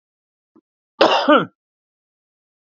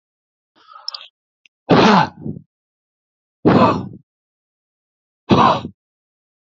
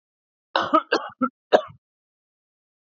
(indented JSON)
{
  "cough_length": "2.7 s",
  "cough_amplitude": 28296,
  "cough_signal_mean_std_ratio": 0.3,
  "exhalation_length": "6.5 s",
  "exhalation_amplitude": 31262,
  "exhalation_signal_mean_std_ratio": 0.34,
  "three_cough_length": "2.9 s",
  "three_cough_amplitude": 26093,
  "three_cough_signal_mean_std_ratio": 0.29,
  "survey_phase": "beta (2021-08-13 to 2022-03-07)",
  "age": "18-44",
  "gender": "Male",
  "wearing_mask": "No",
  "symptom_none": true,
  "smoker_status": "Ex-smoker",
  "respiratory_condition_asthma": false,
  "respiratory_condition_other": false,
  "recruitment_source": "REACT",
  "submission_delay": "3 days",
  "covid_test_result": "Negative",
  "covid_test_method": "RT-qPCR",
  "influenza_a_test_result": "Negative",
  "influenza_b_test_result": "Negative"
}